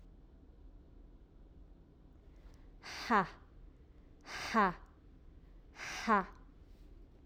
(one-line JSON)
{"exhalation_length": "7.3 s", "exhalation_amplitude": 4311, "exhalation_signal_mean_std_ratio": 0.37, "survey_phase": "alpha (2021-03-01 to 2021-08-12)", "age": "18-44", "gender": "Female", "wearing_mask": "Yes", "symptom_none": true, "smoker_status": "Never smoked", "respiratory_condition_asthma": false, "respiratory_condition_other": false, "recruitment_source": "REACT", "submission_delay": "1 day", "covid_test_result": "Negative", "covid_test_method": "RT-qPCR"}